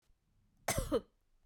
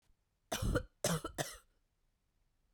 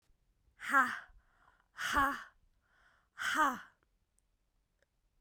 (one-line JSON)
{"cough_length": "1.5 s", "cough_amplitude": 3574, "cough_signal_mean_std_ratio": 0.36, "three_cough_length": "2.7 s", "three_cough_amplitude": 3180, "three_cough_signal_mean_std_ratio": 0.39, "exhalation_length": "5.2 s", "exhalation_amplitude": 5274, "exhalation_signal_mean_std_ratio": 0.35, "survey_phase": "beta (2021-08-13 to 2022-03-07)", "age": "18-44", "gender": "Female", "wearing_mask": "No", "symptom_cough_any": true, "symptom_runny_or_blocked_nose": true, "symptom_shortness_of_breath": true, "symptom_sore_throat": true, "symptom_fatigue": true, "symptom_headache": true, "symptom_onset": "4 days", "smoker_status": "Never smoked", "respiratory_condition_asthma": false, "respiratory_condition_other": false, "recruitment_source": "Test and Trace", "submission_delay": "2 days", "covid_test_result": "Positive", "covid_test_method": "RT-qPCR", "covid_ct_value": 27.9, "covid_ct_gene": "ORF1ab gene", "covid_ct_mean": 28.1, "covid_viral_load": "600 copies/ml", "covid_viral_load_category": "Minimal viral load (< 10K copies/ml)"}